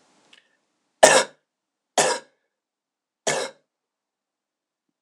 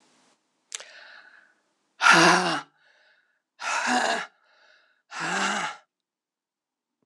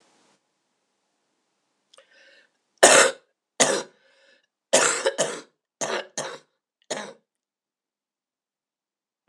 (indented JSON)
{
  "three_cough_length": "5.0 s",
  "three_cough_amplitude": 26028,
  "three_cough_signal_mean_std_ratio": 0.24,
  "exhalation_length": "7.1 s",
  "exhalation_amplitude": 21070,
  "exhalation_signal_mean_std_ratio": 0.37,
  "cough_length": "9.3 s",
  "cough_amplitude": 26028,
  "cough_signal_mean_std_ratio": 0.26,
  "survey_phase": "alpha (2021-03-01 to 2021-08-12)",
  "age": "45-64",
  "gender": "Female",
  "wearing_mask": "No",
  "symptom_cough_any": true,
  "symptom_fatigue": true,
  "symptom_headache": true,
  "symptom_change_to_sense_of_smell_or_taste": true,
  "symptom_loss_of_taste": true,
  "symptom_onset": "6 days",
  "smoker_status": "Ex-smoker",
  "respiratory_condition_asthma": false,
  "respiratory_condition_other": false,
  "recruitment_source": "Test and Trace",
  "submission_delay": "2 days",
  "covid_test_result": "Positive",
  "covid_test_method": "RT-qPCR",
  "covid_ct_value": 20.8,
  "covid_ct_gene": "ORF1ab gene",
  "covid_ct_mean": 21.9,
  "covid_viral_load": "64000 copies/ml",
  "covid_viral_load_category": "Low viral load (10K-1M copies/ml)"
}